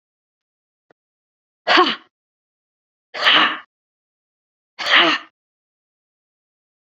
{"exhalation_length": "6.8 s", "exhalation_amplitude": 32388, "exhalation_signal_mean_std_ratio": 0.3, "survey_phase": "beta (2021-08-13 to 2022-03-07)", "age": "18-44", "gender": "Female", "wearing_mask": "No", "symptom_none": true, "symptom_onset": "5 days", "smoker_status": "Ex-smoker", "respiratory_condition_asthma": false, "respiratory_condition_other": false, "recruitment_source": "REACT", "submission_delay": "1 day", "covid_test_result": "Negative", "covid_test_method": "RT-qPCR", "influenza_a_test_result": "Negative", "influenza_b_test_result": "Negative"}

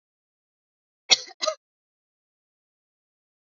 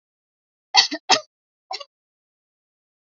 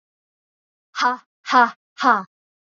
{"cough_length": "3.5 s", "cough_amplitude": 25839, "cough_signal_mean_std_ratio": 0.14, "three_cough_length": "3.1 s", "three_cough_amplitude": 32767, "three_cough_signal_mean_std_ratio": 0.22, "exhalation_length": "2.7 s", "exhalation_amplitude": 26528, "exhalation_signal_mean_std_ratio": 0.34, "survey_phase": "alpha (2021-03-01 to 2021-08-12)", "age": "18-44", "gender": "Female", "wearing_mask": "No", "symptom_none": true, "smoker_status": "Never smoked", "respiratory_condition_asthma": false, "respiratory_condition_other": false, "recruitment_source": "REACT", "submission_delay": "3 days", "covid_test_result": "Negative", "covid_test_method": "RT-qPCR"}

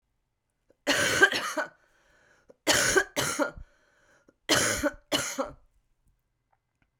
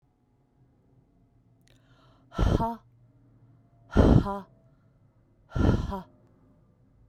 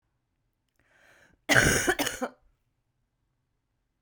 {"cough_length": "7.0 s", "cough_amplitude": 16645, "cough_signal_mean_std_ratio": 0.43, "exhalation_length": "7.1 s", "exhalation_amplitude": 16109, "exhalation_signal_mean_std_ratio": 0.31, "three_cough_length": "4.0 s", "three_cough_amplitude": 20693, "three_cough_signal_mean_std_ratio": 0.3, "survey_phase": "beta (2021-08-13 to 2022-03-07)", "age": "45-64", "gender": "Female", "wearing_mask": "No", "symptom_new_continuous_cough": true, "symptom_runny_or_blocked_nose": true, "symptom_sore_throat": true, "symptom_fever_high_temperature": true, "symptom_headache": true, "symptom_change_to_sense_of_smell_or_taste": true, "symptom_loss_of_taste": true, "symptom_onset": "2 days", "smoker_status": "Never smoked", "respiratory_condition_asthma": true, "respiratory_condition_other": false, "recruitment_source": "Test and Trace", "submission_delay": "2 days", "covid_test_result": "Positive", "covid_test_method": "RT-qPCR", "covid_ct_value": 17.6, "covid_ct_gene": "ORF1ab gene", "covid_ct_mean": 18.1, "covid_viral_load": "1200000 copies/ml", "covid_viral_load_category": "High viral load (>1M copies/ml)"}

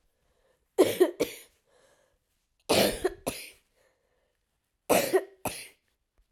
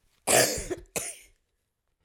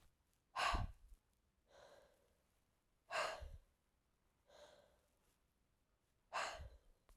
{"three_cough_length": "6.3 s", "three_cough_amplitude": 13403, "three_cough_signal_mean_std_ratio": 0.33, "cough_length": "2.0 s", "cough_amplitude": 15390, "cough_signal_mean_std_ratio": 0.38, "exhalation_length": "7.2 s", "exhalation_amplitude": 1471, "exhalation_signal_mean_std_ratio": 0.33, "survey_phase": "alpha (2021-03-01 to 2021-08-12)", "age": "45-64", "gender": "Female", "wearing_mask": "No", "symptom_cough_any": true, "symptom_new_continuous_cough": true, "symptom_shortness_of_breath": true, "symptom_fatigue": true, "symptom_headache": true, "symptom_loss_of_taste": true, "symptom_onset": "4 days", "smoker_status": "Never smoked", "respiratory_condition_asthma": false, "respiratory_condition_other": false, "recruitment_source": "Test and Trace", "submission_delay": "2 days", "covid_test_result": "Positive", "covid_test_method": "RT-qPCR"}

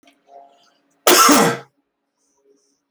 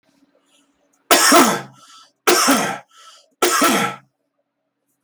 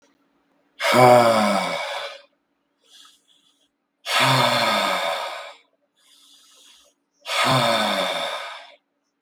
{"cough_length": "2.9 s", "cough_amplitude": 32768, "cough_signal_mean_std_ratio": 0.34, "three_cough_length": "5.0 s", "three_cough_amplitude": 32768, "three_cough_signal_mean_std_ratio": 0.44, "exhalation_length": "9.2 s", "exhalation_amplitude": 32766, "exhalation_signal_mean_std_ratio": 0.5, "survey_phase": "beta (2021-08-13 to 2022-03-07)", "age": "45-64", "gender": "Male", "wearing_mask": "No", "symptom_none": true, "smoker_status": "Ex-smoker", "respiratory_condition_asthma": false, "respiratory_condition_other": false, "recruitment_source": "REACT", "submission_delay": "1 day", "covid_test_result": "Negative", "covid_test_method": "RT-qPCR", "influenza_a_test_result": "Negative", "influenza_b_test_result": "Negative"}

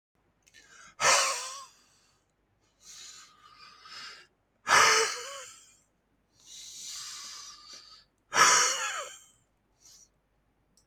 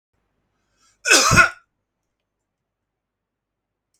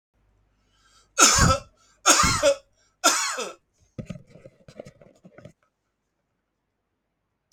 {"exhalation_length": "10.9 s", "exhalation_amplitude": 15337, "exhalation_signal_mean_std_ratio": 0.34, "cough_length": "4.0 s", "cough_amplitude": 32767, "cough_signal_mean_std_ratio": 0.25, "three_cough_length": "7.5 s", "three_cough_amplitude": 30401, "three_cough_signal_mean_std_ratio": 0.33, "survey_phase": "beta (2021-08-13 to 2022-03-07)", "age": "65+", "gender": "Male", "wearing_mask": "No", "symptom_cough_any": true, "symptom_runny_or_blocked_nose": true, "smoker_status": "Never smoked", "respiratory_condition_asthma": false, "respiratory_condition_other": false, "recruitment_source": "REACT", "submission_delay": "2 days", "covid_test_result": "Negative", "covid_test_method": "RT-qPCR", "influenza_a_test_result": "Negative", "influenza_b_test_result": "Negative"}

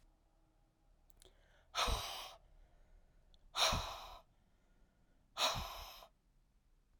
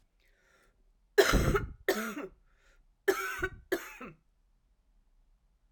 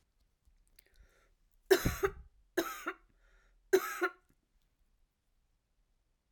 {"exhalation_length": "7.0 s", "exhalation_amplitude": 3164, "exhalation_signal_mean_std_ratio": 0.38, "cough_length": "5.7 s", "cough_amplitude": 10898, "cough_signal_mean_std_ratio": 0.35, "three_cough_length": "6.3 s", "three_cough_amplitude": 8124, "three_cough_signal_mean_std_ratio": 0.26, "survey_phase": "alpha (2021-03-01 to 2021-08-12)", "age": "45-64", "gender": "Female", "wearing_mask": "No", "symptom_cough_any": true, "symptom_new_continuous_cough": true, "symptom_fatigue": true, "symptom_headache": true, "symptom_change_to_sense_of_smell_or_taste": true, "symptom_loss_of_taste": true, "symptom_onset": "4 days", "smoker_status": "Ex-smoker", "respiratory_condition_asthma": false, "respiratory_condition_other": false, "recruitment_source": "Test and Trace", "submission_delay": "2 days", "covid_test_result": "Positive", "covid_test_method": "RT-qPCR"}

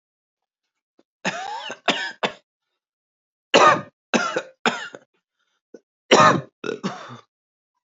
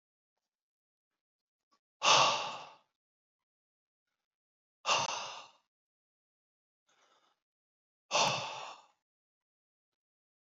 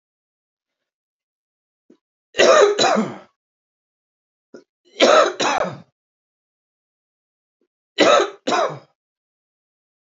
{"cough_length": "7.9 s", "cough_amplitude": 28980, "cough_signal_mean_std_ratio": 0.32, "exhalation_length": "10.4 s", "exhalation_amplitude": 8262, "exhalation_signal_mean_std_ratio": 0.26, "three_cough_length": "10.1 s", "three_cough_amplitude": 29285, "three_cough_signal_mean_std_ratio": 0.33, "survey_phase": "beta (2021-08-13 to 2022-03-07)", "age": "18-44", "gender": "Male", "wearing_mask": "No", "symptom_runny_or_blocked_nose": true, "symptom_fatigue": true, "symptom_change_to_sense_of_smell_or_taste": true, "symptom_loss_of_taste": true, "symptom_onset": "4 days", "smoker_status": "Ex-smoker", "respiratory_condition_asthma": false, "respiratory_condition_other": false, "recruitment_source": "Test and Trace", "submission_delay": "2 days", "covid_test_result": "Positive", "covid_test_method": "RT-qPCR", "covid_ct_value": 20.2, "covid_ct_gene": "N gene", "covid_ct_mean": 20.2, "covid_viral_load": "240000 copies/ml", "covid_viral_load_category": "Low viral load (10K-1M copies/ml)"}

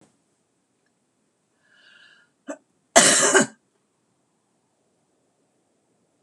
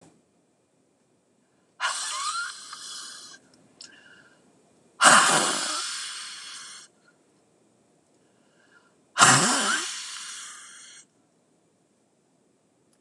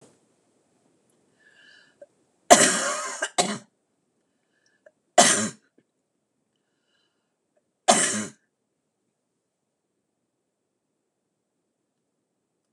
{"cough_length": "6.2 s", "cough_amplitude": 26028, "cough_signal_mean_std_ratio": 0.23, "exhalation_length": "13.0 s", "exhalation_amplitude": 26027, "exhalation_signal_mean_std_ratio": 0.34, "three_cough_length": "12.7 s", "three_cough_amplitude": 26028, "three_cough_signal_mean_std_ratio": 0.23, "survey_phase": "beta (2021-08-13 to 2022-03-07)", "age": "65+", "gender": "Female", "wearing_mask": "No", "symptom_cough_any": true, "symptom_onset": "12 days", "smoker_status": "Never smoked", "respiratory_condition_asthma": true, "respiratory_condition_other": false, "recruitment_source": "REACT", "submission_delay": "2 days", "covid_test_result": "Negative", "covid_test_method": "RT-qPCR"}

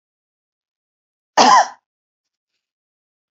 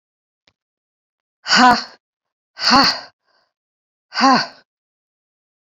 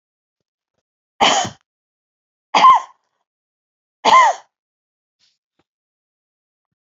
{"cough_length": "3.3 s", "cough_amplitude": 32767, "cough_signal_mean_std_ratio": 0.24, "exhalation_length": "5.6 s", "exhalation_amplitude": 31016, "exhalation_signal_mean_std_ratio": 0.33, "three_cough_length": "6.8 s", "three_cough_amplitude": 28212, "three_cough_signal_mean_std_ratio": 0.27, "survey_phase": "beta (2021-08-13 to 2022-03-07)", "age": "65+", "gender": "Female", "wearing_mask": "No", "symptom_none": true, "smoker_status": "Never smoked", "respiratory_condition_asthma": false, "respiratory_condition_other": false, "recruitment_source": "REACT", "submission_delay": "1 day", "covid_test_result": "Negative", "covid_test_method": "RT-qPCR", "influenza_a_test_result": "Negative", "influenza_b_test_result": "Negative"}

